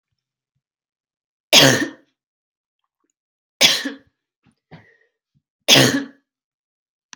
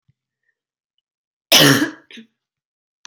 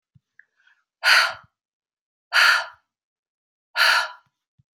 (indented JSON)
{
  "three_cough_length": "7.2 s",
  "three_cough_amplitude": 30344,
  "three_cough_signal_mean_std_ratio": 0.27,
  "cough_length": "3.1 s",
  "cough_amplitude": 32767,
  "cough_signal_mean_std_ratio": 0.27,
  "exhalation_length": "4.7 s",
  "exhalation_amplitude": 21963,
  "exhalation_signal_mean_std_ratio": 0.35,
  "survey_phase": "beta (2021-08-13 to 2022-03-07)",
  "age": "18-44",
  "gender": "Female",
  "wearing_mask": "No",
  "symptom_runny_or_blocked_nose": true,
  "smoker_status": "Never smoked",
  "respiratory_condition_asthma": true,
  "respiratory_condition_other": false,
  "recruitment_source": "Test and Trace",
  "submission_delay": "2 days",
  "covid_test_result": "Positive",
  "covid_test_method": "LFT"
}